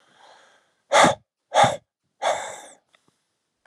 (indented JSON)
{
  "exhalation_length": "3.7 s",
  "exhalation_amplitude": 27940,
  "exhalation_signal_mean_std_ratio": 0.33,
  "survey_phase": "alpha (2021-03-01 to 2021-08-12)",
  "age": "45-64",
  "gender": "Male",
  "wearing_mask": "No",
  "symptom_none": true,
  "smoker_status": "Ex-smoker",
  "respiratory_condition_asthma": false,
  "respiratory_condition_other": false,
  "recruitment_source": "REACT",
  "submission_delay": "2 days",
  "covid_test_result": "Negative",
  "covid_test_method": "RT-qPCR"
}